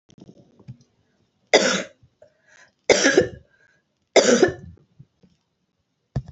{"three_cough_length": "6.3 s", "three_cough_amplitude": 32027, "three_cough_signal_mean_std_ratio": 0.31, "survey_phase": "alpha (2021-03-01 to 2021-08-12)", "age": "45-64", "gender": "Female", "wearing_mask": "No", "symptom_none": true, "smoker_status": "Never smoked", "respiratory_condition_asthma": false, "respiratory_condition_other": false, "recruitment_source": "REACT", "submission_delay": "1 day", "covid_test_result": "Negative", "covid_test_method": "RT-qPCR"}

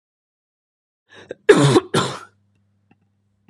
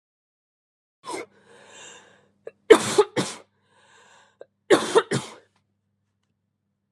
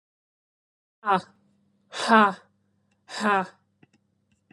{"cough_length": "3.5 s", "cough_amplitude": 32767, "cough_signal_mean_std_ratio": 0.29, "three_cough_length": "6.9 s", "three_cough_amplitude": 32766, "three_cough_signal_mean_std_ratio": 0.23, "exhalation_length": "4.5 s", "exhalation_amplitude": 22198, "exhalation_signal_mean_std_ratio": 0.29, "survey_phase": "beta (2021-08-13 to 2022-03-07)", "age": "18-44", "gender": "Female", "wearing_mask": "No", "symptom_none": true, "smoker_status": "Never smoked", "respiratory_condition_asthma": false, "respiratory_condition_other": false, "recruitment_source": "REACT", "submission_delay": "4 days", "covid_test_result": "Negative", "covid_test_method": "RT-qPCR"}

